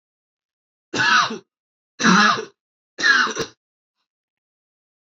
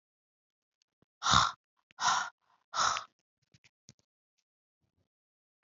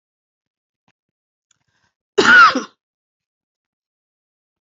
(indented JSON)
{
  "three_cough_length": "5.0 s",
  "three_cough_amplitude": 23487,
  "three_cough_signal_mean_std_ratio": 0.39,
  "exhalation_length": "5.6 s",
  "exhalation_amplitude": 12896,
  "exhalation_signal_mean_std_ratio": 0.28,
  "cough_length": "4.6 s",
  "cough_amplitude": 32767,
  "cough_signal_mean_std_ratio": 0.24,
  "survey_phase": "beta (2021-08-13 to 2022-03-07)",
  "age": "45-64",
  "gender": "Female",
  "wearing_mask": "Yes",
  "symptom_cough_any": true,
  "symptom_new_continuous_cough": true,
  "symptom_runny_or_blocked_nose": true,
  "symptom_shortness_of_breath": true,
  "symptom_sore_throat": true,
  "symptom_abdominal_pain": true,
  "symptom_fatigue": true,
  "symptom_headache": true,
  "symptom_other": true,
  "smoker_status": "Never smoked",
  "respiratory_condition_asthma": false,
  "respiratory_condition_other": false,
  "recruitment_source": "Test and Trace",
  "submission_delay": "1 day",
  "covid_test_result": "Positive",
  "covid_test_method": "LFT"
}